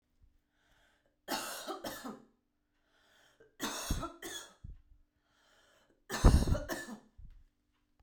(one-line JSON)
{"three_cough_length": "8.0 s", "three_cough_amplitude": 10806, "three_cough_signal_mean_std_ratio": 0.3, "survey_phase": "beta (2021-08-13 to 2022-03-07)", "age": "18-44", "gender": "Female", "wearing_mask": "No", "symptom_none": true, "smoker_status": "Ex-smoker", "respiratory_condition_asthma": false, "respiratory_condition_other": false, "recruitment_source": "REACT", "submission_delay": "7 days", "covid_test_result": "Negative", "covid_test_method": "RT-qPCR"}